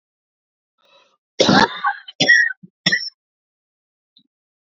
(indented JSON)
{
  "three_cough_length": "4.7 s",
  "three_cough_amplitude": 28984,
  "three_cough_signal_mean_std_ratio": 0.34,
  "survey_phase": "beta (2021-08-13 to 2022-03-07)",
  "age": "18-44",
  "gender": "Male",
  "wearing_mask": "No",
  "symptom_cough_any": true,
  "symptom_new_continuous_cough": true,
  "symptom_runny_or_blocked_nose": true,
  "symptom_shortness_of_breath": true,
  "symptom_sore_throat": true,
  "symptom_fatigue": true,
  "symptom_headache": true,
  "symptom_onset": "4 days",
  "smoker_status": "Never smoked",
  "respiratory_condition_asthma": true,
  "respiratory_condition_other": false,
  "recruitment_source": "Test and Trace",
  "submission_delay": "1 day",
  "covid_test_result": "Positive",
  "covid_test_method": "RT-qPCR",
  "covid_ct_value": 25.3,
  "covid_ct_gene": "ORF1ab gene"
}